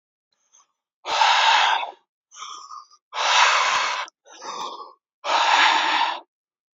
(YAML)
exhalation_length: 6.7 s
exhalation_amplitude: 20311
exhalation_signal_mean_std_ratio: 0.57
survey_phase: beta (2021-08-13 to 2022-03-07)
age: 18-44
gender: Male
wearing_mask: 'No'
symptom_fatigue: true
symptom_fever_high_temperature: true
symptom_headache: true
symptom_onset: 3 days
smoker_status: Never smoked
respiratory_condition_asthma: false
respiratory_condition_other: false
recruitment_source: Test and Trace
submission_delay: 1 day
covid_test_result: Positive
covid_test_method: RT-qPCR
covid_ct_value: 24.2
covid_ct_gene: ORF1ab gene
covid_ct_mean: 26.8
covid_viral_load: 1600 copies/ml
covid_viral_load_category: Minimal viral load (< 10K copies/ml)